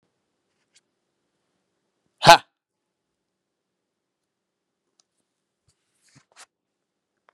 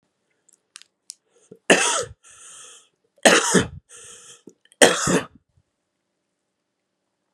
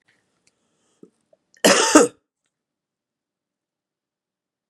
{"exhalation_length": "7.3 s", "exhalation_amplitude": 32768, "exhalation_signal_mean_std_ratio": 0.1, "three_cough_length": "7.3 s", "three_cough_amplitude": 32768, "three_cough_signal_mean_std_ratio": 0.29, "cough_length": "4.7 s", "cough_amplitude": 32767, "cough_signal_mean_std_ratio": 0.22, "survey_phase": "beta (2021-08-13 to 2022-03-07)", "age": "18-44", "gender": "Male", "wearing_mask": "No", "symptom_cough_any": true, "symptom_runny_or_blocked_nose": true, "symptom_sore_throat": true, "symptom_fatigue": true, "symptom_fever_high_temperature": true, "symptom_headache": true, "symptom_onset": "3 days", "smoker_status": "Never smoked", "respiratory_condition_asthma": false, "respiratory_condition_other": false, "recruitment_source": "Test and Trace", "submission_delay": "2 days", "covid_test_result": "Positive", "covid_test_method": "RT-qPCR", "covid_ct_value": 15.5, "covid_ct_gene": "N gene"}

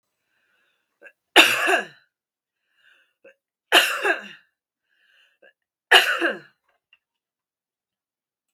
{"three_cough_length": "8.5 s", "three_cough_amplitude": 32768, "three_cough_signal_mean_std_ratio": 0.27, "survey_phase": "beta (2021-08-13 to 2022-03-07)", "age": "18-44", "gender": "Female", "wearing_mask": "No", "symptom_none": true, "smoker_status": "Never smoked", "respiratory_condition_asthma": false, "respiratory_condition_other": false, "recruitment_source": "REACT", "submission_delay": "1 day", "covid_test_result": "Negative", "covid_test_method": "RT-qPCR", "influenza_a_test_result": "Negative", "influenza_b_test_result": "Negative"}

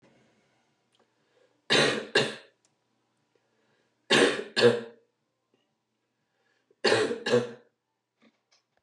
{"three_cough_length": "8.8 s", "three_cough_amplitude": 13727, "three_cough_signal_mean_std_ratio": 0.33, "survey_phase": "beta (2021-08-13 to 2022-03-07)", "age": "45-64", "gender": "Female", "wearing_mask": "No", "symptom_cough_any": true, "symptom_runny_or_blocked_nose": true, "symptom_sore_throat": true, "symptom_fatigue": true, "symptom_headache": true, "symptom_onset": "3 days", "smoker_status": "Ex-smoker", "respiratory_condition_asthma": false, "respiratory_condition_other": false, "recruitment_source": "Test and Trace", "submission_delay": "1 day", "covid_test_result": "Positive", "covid_test_method": "RT-qPCR", "covid_ct_value": 13.9, "covid_ct_gene": "ORF1ab gene"}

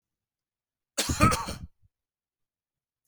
{"cough_length": "3.1 s", "cough_amplitude": 21587, "cough_signal_mean_std_ratio": 0.29, "survey_phase": "beta (2021-08-13 to 2022-03-07)", "age": "45-64", "gender": "Male", "wearing_mask": "No", "symptom_none": true, "smoker_status": "Never smoked", "respiratory_condition_asthma": true, "respiratory_condition_other": false, "recruitment_source": "REACT", "submission_delay": "7 days", "covid_test_result": "Negative", "covid_test_method": "RT-qPCR", "influenza_a_test_result": "Negative", "influenza_b_test_result": "Negative"}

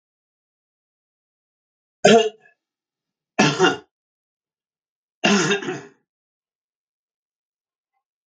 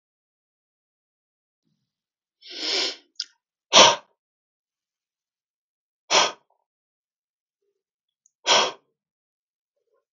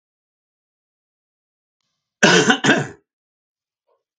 {"three_cough_length": "8.3 s", "three_cough_amplitude": 32767, "three_cough_signal_mean_std_ratio": 0.27, "exhalation_length": "10.1 s", "exhalation_amplitude": 32768, "exhalation_signal_mean_std_ratio": 0.21, "cough_length": "4.2 s", "cough_amplitude": 32768, "cough_signal_mean_std_ratio": 0.28, "survey_phase": "beta (2021-08-13 to 2022-03-07)", "age": "65+", "gender": "Male", "wearing_mask": "No", "symptom_none": true, "smoker_status": "Ex-smoker", "respiratory_condition_asthma": false, "respiratory_condition_other": false, "recruitment_source": "REACT", "submission_delay": "2 days", "covid_test_result": "Negative", "covid_test_method": "RT-qPCR", "influenza_a_test_result": "Negative", "influenza_b_test_result": "Negative"}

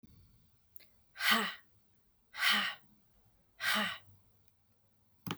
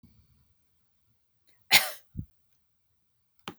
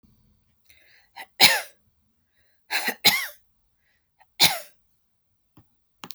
{"exhalation_length": "5.4 s", "exhalation_amplitude": 5570, "exhalation_signal_mean_std_ratio": 0.39, "cough_length": "3.6 s", "cough_amplitude": 22723, "cough_signal_mean_std_ratio": 0.18, "three_cough_length": "6.1 s", "three_cough_amplitude": 32768, "three_cough_signal_mean_std_ratio": 0.26, "survey_phase": "beta (2021-08-13 to 2022-03-07)", "age": "45-64", "gender": "Female", "wearing_mask": "No", "symptom_cough_any": true, "symptom_runny_or_blocked_nose": true, "symptom_onset": "12 days", "smoker_status": "Ex-smoker", "respiratory_condition_asthma": false, "respiratory_condition_other": false, "recruitment_source": "REACT", "submission_delay": "1 day", "covid_test_result": "Negative", "covid_test_method": "RT-qPCR", "influenza_a_test_result": "Negative", "influenza_b_test_result": "Negative"}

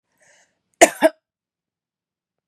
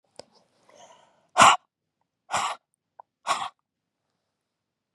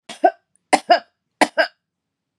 {"cough_length": "2.5 s", "cough_amplitude": 32768, "cough_signal_mean_std_ratio": 0.18, "exhalation_length": "4.9 s", "exhalation_amplitude": 29256, "exhalation_signal_mean_std_ratio": 0.22, "three_cough_length": "2.4 s", "three_cough_amplitude": 32000, "three_cough_signal_mean_std_ratio": 0.29, "survey_phase": "beta (2021-08-13 to 2022-03-07)", "age": "45-64", "gender": "Female", "wearing_mask": "No", "symptom_cough_any": true, "symptom_runny_or_blocked_nose": true, "symptom_sore_throat": true, "symptom_fatigue": true, "symptom_change_to_sense_of_smell_or_taste": true, "symptom_onset": "6 days", "smoker_status": "Ex-smoker", "respiratory_condition_asthma": false, "respiratory_condition_other": false, "recruitment_source": "Test and Trace", "submission_delay": "2 days", "covid_test_result": "Positive", "covid_test_method": "RT-qPCR", "covid_ct_value": 24.7, "covid_ct_gene": "N gene"}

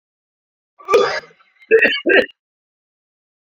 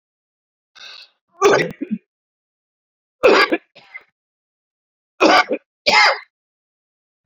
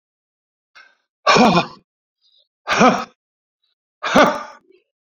{"cough_length": "3.6 s", "cough_amplitude": 31098, "cough_signal_mean_std_ratio": 0.36, "three_cough_length": "7.3 s", "three_cough_amplitude": 30722, "three_cough_signal_mean_std_ratio": 0.34, "exhalation_length": "5.1 s", "exhalation_amplitude": 30575, "exhalation_signal_mean_std_ratio": 0.36, "survey_phase": "beta (2021-08-13 to 2022-03-07)", "age": "65+", "gender": "Male", "wearing_mask": "No", "symptom_cough_any": true, "symptom_abdominal_pain": true, "symptom_headache": true, "symptom_change_to_sense_of_smell_or_taste": true, "symptom_onset": "3 days", "smoker_status": "Ex-smoker", "respiratory_condition_asthma": false, "respiratory_condition_other": true, "recruitment_source": "Test and Trace", "submission_delay": "2 days", "covid_test_result": "Positive", "covid_test_method": "RT-qPCR", "covid_ct_value": 11.3, "covid_ct_gene": "N gene", "covid_ct_mean": 11.6, "covid_viral_load": "160000000 copies/ml", "covid_viral_load_category": "High viral load (>1M copies/ml)"}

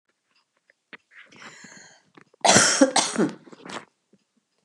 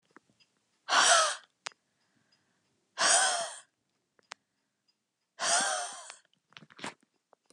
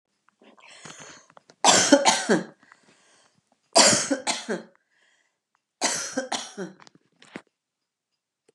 {"cough_length": "4.6 s", "cough_amplitude": 31453, "cough_signal_mean_std_ratio": 0.33, "exhalation_length": "7.5 s", "exhalation_amplitude": 10149, "exhalation_signal_mean_std_ratio": 0.35, "three_cough_length": "8.5 s", "three_cough_amplitude": 29020, "three_cough_signal_mean_std_ratio": 0.34, "survey_phase": "beta (2021-08-13 to 2022-03-07)", "age": "45-64", "gender": "Female", "wearing_mask": "No", "symptom_none": true, "smoker_status": "Never smoked", "respiratory_condition_asthma": false, "respiratory_condition_other": false, "recruitment_source": "REACT", "submission_delay": "1 day", "covid_test_result": "Negative", "covid_test_method": "RT-qPCR", "influenza_a_test_result": "Negative", "influenza_b_test_result": "Negative"}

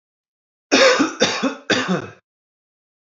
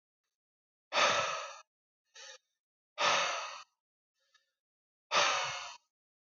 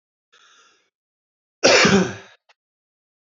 {"three_cough_length": "3.1 s", "three_cough_amplitude": 26539, "three_cough_signal_mean_std_ratio": 0.46, "exhalation_length": "6.4 s", "exhalation_amplitude": 6813, "exhalation_signal_mean_std_ratio": 0.4, "cough_length": "3.2 s", "cough_amplitude": 26776, "cough_signal_mean_std_ratio": 0.31, "survey_phase": "beta (2021-08-13 to 2022-03-07)", "age": "18-44", "gender": "Male", "wearing_mask": "No", "symptom_none": true, "smoker_status": "Never smoked", "respiratory_condition_asthma": false, "respiratory_condition_other": false, "recruitment_source": "REACT", "submission_delay": "2 days", "covid_test_result": "Negative", "covid_test_method": "RT-qPCR", "influenza_a_test_result": "Negative", "influenza_b_test_result": "Negative"}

